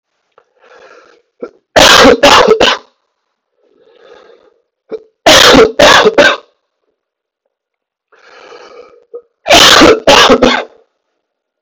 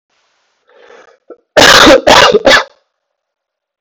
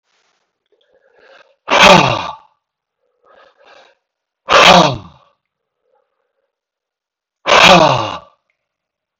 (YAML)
three_cough_length: 11.6 s
three_cough_amplitude: 32768
three_cough_signal_mean_std_ratio: 0.47
cough_length: 3.8 s
cough_amplitude: 32768
cough_signal_mean_std_ratio: 0.46
exhalation_length: 9.2 s
exhalation_amplitude: 32768
exhalation_signal_mean_std_ratio: 0.33
survey_phase: beta (2021-08-13 to 2022-03-07)
age: 45-64
gender: Male
wearing_mask: 'No'
symptom_cough_any: true
symptom_runny_or_blocked_nose: true
symptom_onset: 3 days
smoker_status: Current smoker (1 to 10 cigarettes per day)
respiratory_condition_asthma: false
respiratory_condition_other: false
recruitment_source: Test and Trace
submission_delay: 2 days
covid_test_result: Positive
covid_test_method: RT-qPCR
covid_ct_value: 13.4
covid_ct_gene: S gene
covid_ct_mean: 13.7
covid_viral_load: 31000000 copies/ml
covid_viral_load_category: High viral load (>1M copies/ml)